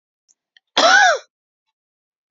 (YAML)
cough_length: 2.3 s
cough_amplitude: 30040
cough_signal_mean_std_ratio: 0.35
survey_phase: beta (2021-08-13 to 2022-03-07)
age: 45-64
gender: Female
wearing_mask: 'No'
symptom_none: true
smoker_status: Ex-smoker
respiratory_condition_asthma: false
respiratory_condition_other: false
recruitment_source: REACT
submission_delay: 2 days
covid_test_result: Negative
covid_test_method: RT-qPCR